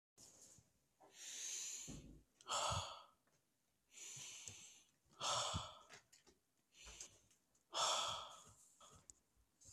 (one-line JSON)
{"exhalation_length": "9.7 s", "exhalation_amplitude": 1419, "exhalation_signal_mean_std_ratio": 0.46, "survey_phase": "beta (2021-08-13 to 2022-03-07)", "age": "18-44", "gender": "Male", "wearing_mask": "No", "symptom_cough_any": true, "symptom_new_continuous_cough": true, "symptom_runny_or_blocked_nose": true, "symptom_sore_throat": true, "symptom_fatigue": true, "symptom_fever_high_temperature": true, "symptom_other": true, "symptom_onset": "2 days", "smoker_status": "Ex-smoker", "respiratory_condition_asthma": false, "respiratory_condition_other": false, "recruitment_source": "Test and Trace", "submission_delay": "1 day", "covid_test_result": "Positive", "covid_test_method": "RT-qPCR", "covid_ct_value": 20.3, "covid_ct_gene": "ORF1ab gene"}